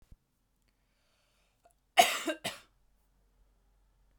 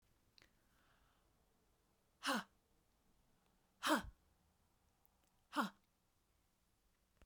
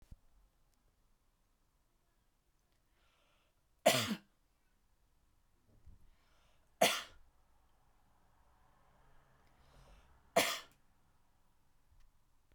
{
  "cough_length": "4.2 s",
  "cough_amplitude": 13093,
  "cough_signal_mean_std_ratio": 0.2,
  "exhalation_length": "7.3 s",
  "exhalation_amplitude": 2199,
  "exhalation_signal_mean_std_ratio": 0.23,
  "three_cough_length": "12.5 s",
  "three_cough_amplitude": 6836,
  "three_cough_signal_mean_std_ratio": 0.2,
  "survey_phase": "beta (2021-08-13 to 2022-03-07)",
  "age": "18-44",
  "gender": "Female",
  "wearing_mask": "No",
  "symptom_none": true,
  "symptom_onset": "3 days",
  "smoker_status": "Never smoked",
  "respiratory_condition_asthma": false,
  "respiratory_condition_other": false,
  "recruitment_source": "Test and Trace",
  "submission_delay": "2 days",
  "covid_test_result": "Positive",
  "covid_test_method": "RT-qPCR",
  "covid_ct_value": 29.4,
  "covid_ct_gene": "ORF1ab gene"
}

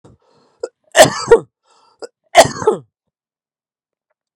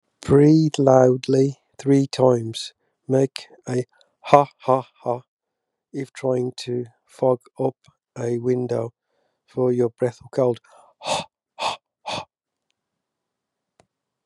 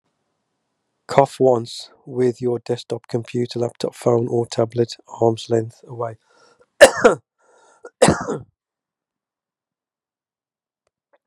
{
  "three_cough_length": "4.4 s",
  "three_cough_amplitude": 32768,
  "three_cough_signal_mean_std_ratio": 0.27,
  "exhalation_length": "14.3 s",
  "exhalation_amplitude": 32768,
  "exhalation_signal_mean_std_ratio": 0.43,
  "cough_length": "11.3 s",
  "cough_amplitude": 32768,
  "cough_signal_mean_std_ratio": 0.35,
  "survey_phase": "beta (2021-08-13 to 2022-03-07)",
  "age": "45-64",
  "gender": "Male",
  "wearing_mask": "Yes",
  "symptom_cough_any": true,
  "symptom_sore_throat": true,
  "smoker_status": "Never smoked",
  "respiratory_condition_asthma": false,
  "respiratory_condition_other": false,
  "recruitment_source": "Test and Trace",
  "submission_delay": "1 day",
  "covid_test_result": "Positive",
  "covid_test_method": "RT-qPCR",
  "covid_ct_value": 23.5,
  "covid_ct_gene": "ORF1ab gene",
  "covid_ct_mean": 23.8,
  "covid_viral_load": "16000 copies/ml",
  "covid_viral_load_category": "Low viral load (10K-1M copies/ml)"
}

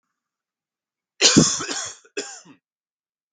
{
  "three_cough_length": "3.3 s",
  "three_cough_amplitude": 32766,
  "three_cough_signal_mean_std_ratio": 0.31,
  "survey_phase": "beta (2021-08-13 to 2022-03-07)",
  "age": "18-44",
  "gender": "Male",
  "wearing_mask": "No",
  "symptom_cough_any": true,
  "smoker_status": "Never smoked",
  "respiratory_condition_asthma": false,
  "respiratory_condition_other": false,
  "recruitment_source": "REACT",
  "submission_delay": "1 day",
  "covid_test_result": "Negative",
  "covid_test_method": "RT-qPCR"
}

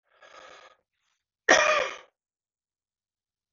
{
  "cough_length": "3.5 s",
  "cough_amplitude": 20817,
  "cough_signal_mean_std_ratio": 0.26,
  "survey_phase": "beta (2021-08-13 to 2022-03-07)",
  "age": "45-64",
  "gender": "Male",
  "wearing_mask": "No",
  "symptom_cough_any": true,
  "symptom_runny_or_blocked_nose": true,
  "symptom_shortness_of_breath": true,
  "symptom_onset": "5 days",
  "smoker_status": "Ex-smoker",
  "respiratory_condition_asthma": false,
  "respiratory_condition_other": false,
  "recruitment_source": "Test and Trace",
  "submission_delay": "2 days",
  "covid_test_result": "Positive",
  "covid_test_method": "RT-qPCR",
  "covid_ct_value": 33.9,
  "covid_ct_gene": "N gene"
}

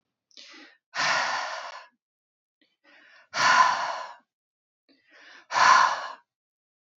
{
  "exhalation_length": "7.0 s",
  "exhalation_amplitude": 18843,
  "exhalation_signal_mean_std_ratio": 0.39,
  "survey_phase": "beta (2021-08-13 to 2022-03-07)",
  "age": "45-64",
  "gender": "Female",
  "wearing_mask": "No",
  "symptom_cough_any": true,
  "symptom_runny_or_blocked_nose": true,
  "symptom_sore_throat": true,
  "smoker_status": "Never smoked",
  "respiratory_condition_asthma": false,
  "respiratory_condition_other": false,
  "recruitment_source": "REACT",
  "submission_delay": "6 days",
  "covid_test_result": "Negative",
  "covid_test_method": "RT-qPCR",
  "influenza_a_test_result": "Negative",
  "influenza_b_test_result": "Negative"
}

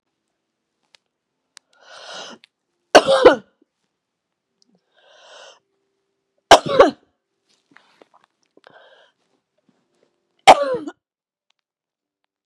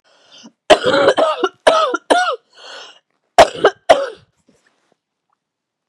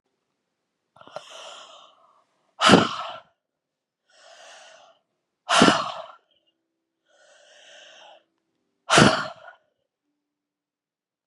{
  "three_cough_length": "12.5 s",
  "three_cough_amplitude": 32768,
  "three_cough_signal_mean_std_ratio": 0.2,
  "cough_length": "5.9 s",
  "cough_amplitude": 32768,
  "cough_signal_mean_std_ratio": 0.39,
  "exhalation_length": "11.3 s",
  "exhalation_amplitude": 32414,
  "exhalation_signal_mean_std_ratio": 0.25,
  "survey_phase": "beta (2021-08-13 to 2022-03-07)",
  "age": "45-64",
  "gender": "Female",
  "wearing_mask": "No",
  "symptom_cough_any": true,
  "symptom_runny_or_blocked_nose": true,
  "symptom_fatigue": true,
  "symptom_fever_high_temperature": true,
  "symptom_headache": true,
  "symptom_other": true,
  "smoker_status": "Ex-smoker",
  "respiratory_condition_asthma": false,
  "respiratory_condition_other": false,
  "recruitment_source": "Test and Trace",
  "submission_delay": "2 days",
  "covid_test_result": "Positive",
  "covid_test_method": "RT-qPCR",
  "covid_ct_value": 19.1,
  "covid_ct_gene": "ORF1ab gene",
  "covid_ct_mean": 19.5,
  "covid_viral_load": "410000 copies/ml",
  "covid_viral_load_category": "Low viral load (10K-1M copies/ml)"
}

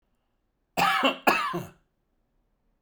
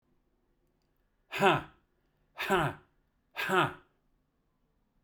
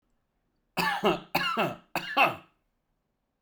{
  "cough_length": "2.8 s",
  "cough_amplitude": 17382,
  "cough_signal_mean_std_ratio": 0.41,
  "exhalation_length": "5.0 s",
  "exhalation_amplitude": 9537,
  "exhalation_signal_mean_std_ratio": 0.33,
  "three_cough_length": "3.4 s",
  "three_cough_amplitude": 10782,
  "three_cough_signal_mean_std_ratio": 0.44,
  "survey_phase": "beta (2021-08-13 to 2022-03-07)",
  "age": "45-64",
  "gender": "Male",
  "wearing_mask": "No",
  "symptom_none": true,
  "smoker_status": "Never smoked",
  "respiratory_condition_asthma": false,
  "respiratory_condition_other": false,
  "recruitment_source": "Test and Trace",
  "submission_delay": "2 days",
  "covid_test_result": "Positive",
  "covid_test_method": "RT-qPCR",
  "covid_ct_value": 32.2,
  "covid_ct_gene": "ORF1ab gene"
}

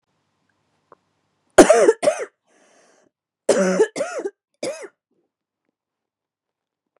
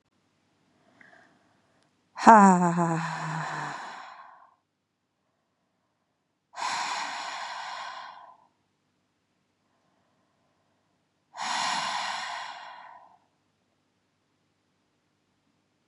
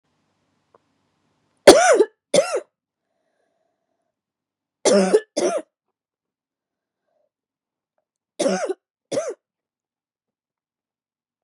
{
  "cough_length": "7.0 s",
  "cough_amplitude": 32768,
  "cough_signal_mean_std_ratio": 0.28,
  "exhalation_length": "15.9 s",
  "exhalation_amplitude": 32667,
  "exhalation_signal_mean_std_ratio": 0.28,
  "three_cough_length": "11.4 s",
  "three_cough_amplitude": 32768,
  "three_cough_signal_mean_std_ratio": 0.26,
  "survey_phase": "beta (2021-08-13 to 2022-03-07)",
  "age": "18-44",
  "gender": "Female",
  "wearing_mask": "Yes",
  "symptom_cough_any": true,
  "symptom_fatigue": true,
  "symptom_onset": "3 days",
  "smoker_status": "Never smoked",
  "respiratory_condition_asthma": false,
  "respiratory_condition_other": false,
  "recruitment_source": "Test and Trace",
  "submission_delay": "2 days",
  "covid_test_result": "Positive",
  "covid_test_method": "RT-qPCR",
  "covid_ct_value": 23.3,
  "covid_ct_gene": "ORF1ab gene"
}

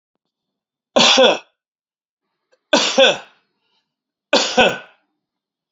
{
  "three_cough_length": "5.7 s",
  "three_cough_amplitude": 30758,
  "three_cough_signal_mean_std_ratio": 0.36,
  "survey_phase": "beta (2021-08-13 to 2022-03-07)",
  "age": "65+",
  "gender": "Male",
  "wearing_mask": "No",
  "symptom_headache": true,
  "symptom_onset": "12 days",
  "smoker_status": "Ex-smoker",
  "respiratory_condition_asthma": false,
  "respiratory_condition_other": false,
  "recruitment_source": "REACT",
  "submission_delay": "28 days",
  "covid_test_result": "Negative",
  "covid_test_method": "RT-qPCR",
  "influenza_a_test_result": "Negative",
  "influenza_b_test_result": "Negative"
}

